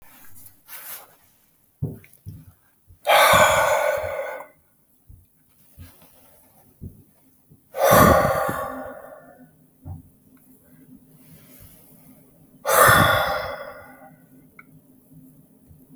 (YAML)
exhalation_length: 16.0 s
exhalation_amplitude: 28729
exhalation_signal_mean_std_ratio: 0.37
survey_phase: beta (2021-08-13 to 2022-03-07)
age: 65+
gender: Male
wearing_mask: 'No'
symptom_cough_any: true
symptom_onset: 12 days
smoker_status: Never smoked
respiratory_condition_asthma: false
respiratory_condition_other: false
recruitment_source: REACT
submission_delay: 0 days
covid_test_result: Positive
covid_test_method: RT-qPCR
covid_ct_value: 23.0
covid_ct_gene: E gene
influenza_a_test_result: Negative
influenza_b_test_result: Negative